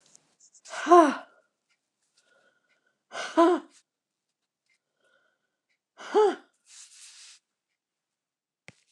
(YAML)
exhalation_length: 8.9 s
exhalation_amplitude: 20470
exhalation_signal_mean_std_ratio: 0.24
survey_phase: beta (2021-08-13 to 2022-03-07)
age: 65+
gender: Female
wearing_mask: 'No'
symptom_none: true
smoker_status: Never smoked
respiratory_condition_asthma: false
respiratory_condition_other: false
recruitment_source: REACT
submission_delay: 0 days
covid_test_result: Negative
covid_test_method: RT-qPCR